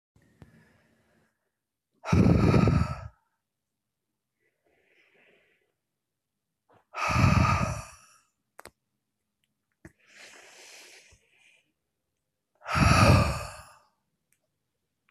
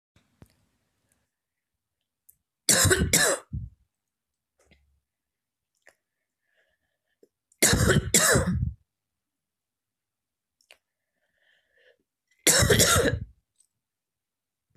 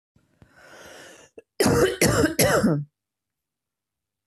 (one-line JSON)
{"exhalation_length": "15.1 s", "exhalation_amplitude": 14378, "exhalation_signal_mean_std_ratio": 0.32, "three_cough_length": "14.8 s", "three_cough_amplitude": 21281, "three_cough_signal_mean_std_ratio": 0.32, "cough_length": "4.3 s", "cough_amplitude": 19724, "cough_signal_mean_std_ratio": 0.44, "survey_phase": "beta (2021-08-13 to 2022-03-07)", "age": "18-44", "gender": "Female", "wearing_mask": "No", "symptom_sore_throat": true, "smoker_status": "Ex-smoker", "respiratory_condition_asthma": false, "respiratory_condition_other": false, "recruitment_source": "Test and Trace", "submission_delay": "2 days", "covid_test_result": "Negative", "covid_test_method": "RT-qPCR"}